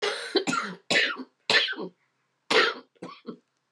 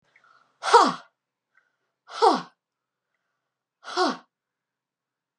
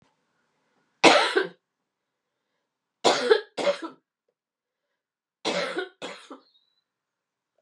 {
  "cough_length": "3.7 s",
  "cough_amplitude": 14490,
  "cough_signal_mean_std_ratio": 0.5,
  "exhalation_length": "5.4 s",
  "exhalation_amplitude": 25657,
  "exhalation_signal_mean_std_ratio": 0.26,
  "three_cough_length": "7.6 s",
  "three_cough_amplitude": 28373,
  "three_cough_signal_mean_std_ratio": 0.29,
  "survey_phase": "beta (2021-08-13 to 2022-03-07)",
  "age": "45-64",
  "gender": "Female",
  "wearing_mask": "No",
  "symptom_new_continuous_cough": true,
  "symptom_runny_or_blocked_nose": true,
  "symptom_sore_throat": true,
  "symptom_headache": true,
  "symptom_change_to_sense_of_smell_or_taste": true,
  "symptom_onset": "2 days",
  "smoker_status": "Never smoked",
  "respiratory_condition_asthma": false,
  "respiratory_condition_other": false,
  "recruitment_source": "REACT",
  "submission_delay": "3 days",
  "covid_test_result": "Positive",
  "covid_test_method": "RT-qPCR",
  "covid_ct_value": 17.0,
  "covid_ct_gene": "E gene",
  "influenza_a_test_result": "Negative",
  "influenza_b_test_result": "Negative"
}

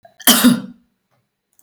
{
  "cough_length": "1.6 s",
  "cough_amplitude": 32768,
  "cough_signal_mean_std_ratio": 0.37,
  "survey_phase": "alpha (2021-03-01 to 2021-08-12)",
  "age": "45-64",
  "gender": "Female",
  "wearing_mask": "No",
  "symptom_none": true,
  "smoker_status": "Never smoked",
  "respiratory_condition_asthma": false,
  "respiratory_condition_other": false,
  "recruitment_source": "REACT",
  "submission_delay": "1 day",
  "covid_test_result": "Negative",
  "covid_test_method": "RT-qPCR"
}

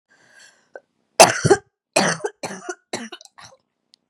{
  "three_cough_length": "4.1 s",
  "three_cough_amplitude": 32768,
  "three_cough_signal_mean_std_ratio": 0.27,
  "survey_phase": "beta (2021-08-13 to 2022-03-07)",
  "age": "18-44",
  "gender": "Female",
  "wearing_mask": "No",
  "symptom_new_continuous_cough": true,
  "symptom_runny_or_blocked_nose": true,
  "symptom_shortness_of_breath": true,
  "symptom_sore_throat": true,
  "symptom_diarrhoea": true,
  "symptom_fatigue": true,
  "symptom_fever_high_temperature": true,
  "symptom_headache": true,
  "symptom_change_to_sense_of_smell_or_taste": true,
  "symptom_loss_of_taste": true,
  "symptom_onset": "3 days",
  "smoker_status": "Current smoker (e-cigarettes or vapes only)",
  "respiratory_condition_asthma": false,
  "respiratory_condition_other": false,
  "recruitment_source": "Test and Trace",
  "submission_delay": "1 day",
  "covid_test_result": "Positive",
  "covid_test_method": "RT-qPCR",
  "covid_ct_value": 20.7,
  "covid_ct_gene": "ORF1ab gene",
  "covid_ct_mean": 21.3,
  "covid_viral_load": "99000 copies/ml",
  "covid_viral_load_category": "Low viral load (10K-1M copies/ml)"
}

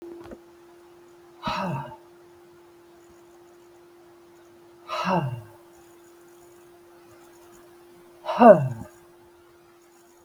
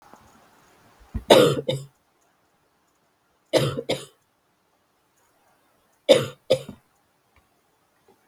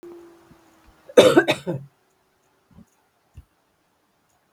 {
  "exhalation_length": "10.2 s",
  "exhalation_amplitude": 32766,
  "exhalation_signal_mean_std_ratio": 0.25,
  "three_cough_length": "8.3 s",
  "three_cough_amplitude": 32768,
  "three_cough_signal_mean_std_ratio": 0.25,
  "cough_length": "4.5 s",
  "cough_amplitude": 32768,
  "cough_signal_mean_std_ratio": 0.23,
  "survey_phase": "beta (2021-08-13 to 2022-03-07)",
  "age": "65+",
  "gender": "Female",
  "wearing_mask": "No",
  "symptom_cough_any": true,
  "smoker_status": "Never smoked",
  "respiratory_condition_asthma": false,
  "respiratory_condition_other": false,
  "recruitment_source": "REACT",
  "submission_delay": "1 day",
  "covid_test_result": "Negative",
  "covid_test_method": "RT-qPCR",
  "influenza_a_test_result": "Negative",
  "influenza_b_test_result": "Negative"
}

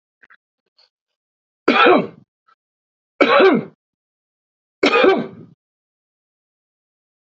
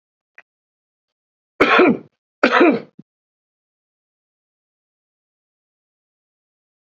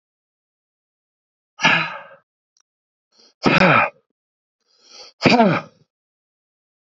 {
  "three_cough_length": "7.3 s",
  "three_cough_amplitude": 29702,
  "three_cough_signal_mean_std_ratio": 0.33,
  "cough_length": "7.0 s",
  "cough_amplitude": 29385,
  "cough_signal_mean_std_ratio": 0.25,
  "exhalation_length": "7.0 s",
  "exhalation_amplitude": 27605,
  "exhalation_signal_mean_std_ratio": 0.31,
  "survey_phase": "beta (2021-08-13 to 2022-03-07)",
  "age": "65+",
  "gender": "Male",
  "wearing_mask": "No",
  "symptom_runny_or_blocked_nose": true,
  "smoker_status": "Current smoker (11 or more cigarettes per day)",
  "respiratory_condition_asthma": false,
  "respiratory_condition_other": false,
  "recruitment_source": "REACT",
  "submission_delay": "1 day",
  "covid_test_result": "Negative",
  "covid_test_method": "RT-qPCR",
  "influenza_a_test_result": "Unknown/Void",
  "influenza_b_test_result": "Unknown/Void"
}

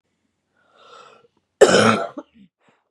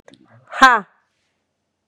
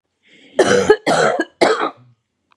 {
  "cough_length": "2.9 s",
  "cough_amplitude": 32768,
  "cough_signal_mean_std_ratio": 0.3,
  "exhalation_length": "1.9 s",
  "exhalation_amplitude": 32768,
  "exhalation_signal_mean_std_ratio": 0.24,
  "three_cough_length": "2.6 s",
  "three_cough_amplitude": 32768,
  "three_cough_signal_mean_std_ratio": 0.52,
  "survey_phase": "beta (2021-08-13 to 2022-03-07)",
  "age": "45-64",
  "gender": "Female",
  "wearing_mask": "No",
  "symptom_cough_any": true,
  "symptom_runny_or_blocked_nose": true,
  "symptom_onset": "5 days",
  "smoker_status": "Ex-smoker",
  "respiratory_condition_asthma": true,
  "respiratory_condition_other": false,
  "recruitment_source": "Test and Trace",
  "submission_delay": "1 day",
  "covid_test_result": "Positive",
  "covid_test_method": "RT-qPCR",
  "covid_ct_value": 27.2,
  "covid_ct_gene": "N gene"
}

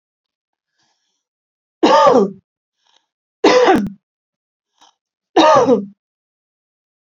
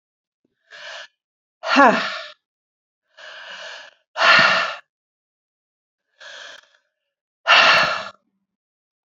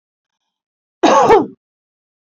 {
  "three_cough_length": "7.1 s",
  "three_cough_amplitude": 28284,
  "three_cough_signal_mean_std_ratio": 0.37,
  "exhalation_length": "9.0 s",
  "exhalation_amplitude": 30540,
  "exhalation_signal_mean_std_ratio": 0.34,
  "cough_length": "2.4 s",
  "cough_amplitude": 28752,
  "cough_signal_mean_std_ratio": 0.35,
  "survey_phase": "beta (2021-08-13 to 2022-03-07)",
  "age": "45-64",
  "gender": "Female",
  "wearing_mask": "No",
  "symptom_none": true,
  "smoker_status": "Current smoker (1 to 10 cigarettes per day)",
  "respiratory_condition_asthma": false,
  "respiratory_condition_other": false,
  "recruitment_source": "REACT",
  "submission_delay": "1 day",
  "covid_test_result": "Negative",
  "covid_test_method": "RT-qPCR"
}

